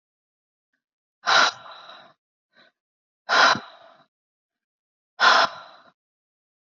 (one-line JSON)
{"exhalation_length": "6.7 s", "exhalation_amplitude": 22951, "exhalation_signal_mean_std_ratio": 0.29, "survey_phase": "beta (2021-08-13 to 2022-03-07)", "age": "18-44", "gender": "Female", "wearing_mask": "No", "symptom_runny_or_blocked_nose": true, "symptom_sore_throat": true, "symptom_onset": "6 days", "smoker_status": "Never smoked", "respiratory_condition_asthma": false, "respiratory_condition_other": false, "recruitment_source": "Test and Trace", "submission_delay": "2 days", "covid_test_result": "Negative", "covid_test_method": "RT-qPCR"}